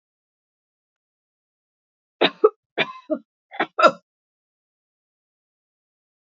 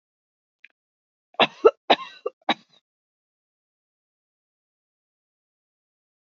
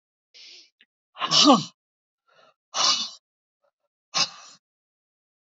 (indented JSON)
{
  "three_cough_length": "6.3 s",
  "three_cough_amplitude": 29861,
  "three_cough_signal_mean_std_ratio": 0.19,
  "cough_length": "6.2 s",
  "cough_amplitude": 27019,
  "cough_signal_mean_std_ratio": 0.15,
  "exhalation_length": "5.5 s",
  "exhalation_amplitude": 18141,
  "exhalation_signal_mean_std_ratio": 0.29,
  "survey_phase": "beta (2021-08-13 to 2022-03-07)",
  "age": "65+",
  "gender": "Female",
  "wearing_mask": "No",
  "symptom_none": true,
  "smoker_status": "Never smoked",
  "respiratory_condition_asthma": false,
  "respiratory_condition_other": false,
  "recruitment_source": "REACT",
  "submission_delay": "1 day",
  "covid_test_result": "Negative",
  "covid_test_method": "RT-qPCR",
  "influenza_a_test_result": "Negative",
  "influenza_b_test_result": "Negative"
}